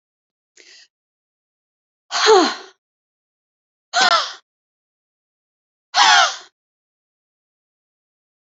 {"exhalation_length": "8.5 s", "exhalation_amplitude": 30810, "exhalation_signal_mean_std_ratio": 0.28, "survey_phase": "alpha (2021-03-01 to 2021-08-12)", "age": "65+", "gender": "Female", "wearing_mask": "No", "symptom_none": true, "smoker_status": "Never smoked", "respiratory_condition_asthma": true, "respiratory_condition_other": false, "recruitment_source": "REACT", "submission_delay": "3 days", "covid_test_result": "Negative", "covid_test_method": "RT-qPCR"}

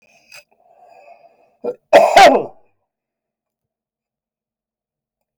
{"cough_length": "5.4 s", "cough_amplitude": 32768, "cough_signal_mean_std_ratio": 0.26, "survey_phase": "beta (2021-08-13 to 2022-03-07)", "age": "45-64", "gender": "Male", "wearing_mask": "No", "symptom_none": true, "smoker_status": "Never smoked", "respiratory_condition_asthma": false, "respiratory_condition_other": false, "recruitment_source": "REACT", "submission_delay": "3 days", "covid_test_result": "Negative", "covid_test_method": "RT-qPCR", "influenza_a_test_result": "Negative", "influenza_b_test_result": "Negative"}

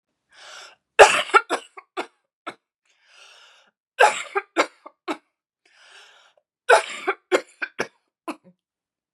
{"three_cough_length": "9.1 s", "three_cough_amplitude": 32768, "three_cough_signal_mean_std_ratio": 0.25, "survey_phase": "beta (2021-08-13 to 2022-03-07)", "age": "18-44", "gender": "Female", "wearing_mask": "No", "symptom_cough_any": true, "symptom_runny_or_blocked_nose": true, "symptom_shortness_of_breath": true, "symptom_sore_throat": true, "symptom_fatigue": true, "symptom_headache": true, "symptom_onset": "3 days", "smoker_status": "Ex-smoker", "respiratory_condition_asthma": true, "respiratory_condition_other": false, "recruitment_source": "Test and Trace", "submission_delay": "1 day", "covid_test_result": "Positive", "covid_test_method": "RT-qPCR", "covid_ct_value": 16.5, "covid_ct_gene": "ORF1ab gene", "covid_ct_mean": 16.8, "covid_viral_load": "3100000 copies/ml", "covid_viral_load_category": "High viral load (>1M copies/ml)"}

